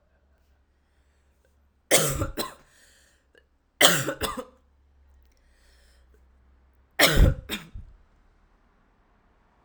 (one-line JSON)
{"cough_length": "9.6 s", "cough_amplitude": 32767, "cough_signal_mean_std_ratio": 0.28, "survey_phase": "alpha (2021-03-01 to 2021-08-12)", "age": "18-44", "gender": "Female", "wearing_mask": "No", "symptom_cough_any": true, "symptom_new_continuous_cough": true, "symptom_diarrhoea": true, "symptom_fatigue": true, "symptom_headache": true, "smoker_status": "Never smoked", "respiratory_condition_asthma": false, "respiratory_condition_other": false, "recruitment_source": "Test and Trace", "submission_delay": "3 days", "covid_test_result": "Positive", "covid_test_method": "RT-qPCR", "covid_ct_value": 32.3, "covid_ct_gene": "ORF1ab gene"}